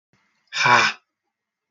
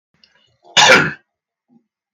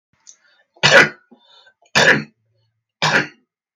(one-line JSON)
{"exhalation_length": "1.7 s", "exhalation_amplitude": 30140, "exhalation_signal_mean_std_ratio": 0.37, "cough_length": "2.1 s", "cough_amplitude": 32768, "cough_signal_mean_std_ratio": 0.32, "three_cough_length": "3.8 s", "three_cough_amplitude": 32768, "three_cough_signal_mean_std_ratio": 0.35, "survey_phase": "beta (2021-08-13 to 2022-03-07)", "age": "45-64", "gender": "Male", "wearing_mask": "No", "symptom_none": true, "smoker_status": "Never smoked", "respiratory_condition_asthma": false, "respiratory_condition_other": false, "recruitment_source": "REACT", "submission_delay": "1 day", "covid_test_result": "Negative", "covid_test_method": "RT-qPCR", "influenza_a_test_result": "Negative", "influenza_b_test_result": "Negative"}